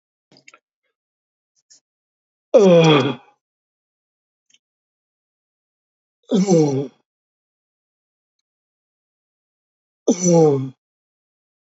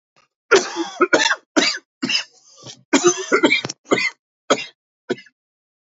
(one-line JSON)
{"exhalation_length": "11.7 s", "exhalation_amplitude": 27914, "exhalation_signal_mean_std_ratio": 0.3, "cough_length": "6.0 s", "cough_amplitude": 28717, "cough_signal_mean_std_ratio": 0.43, "survey_phase": "alpha (2021-03-01 to 2021-08-12)", "age": "45-64", "gender": "Male", "wearing_mask": "No", "symptom_cough_any": true, "symptom_shortness_of_breath": true, "symptom_abdominal_pain": true, "symptom_diarrhoea": true, "symptom_fatigue": true, "symptom_headache": true, "symptom_onset": "5 days", "smoker_status": "Never smoked", "respiratory_condition_asthma": true, "respiratory_condition_other": false, "recruitment_source": "REACT", "submission_delay": "1 day", "covid_test_result": "Negative", "covid_test_method": "RT-qPCR"}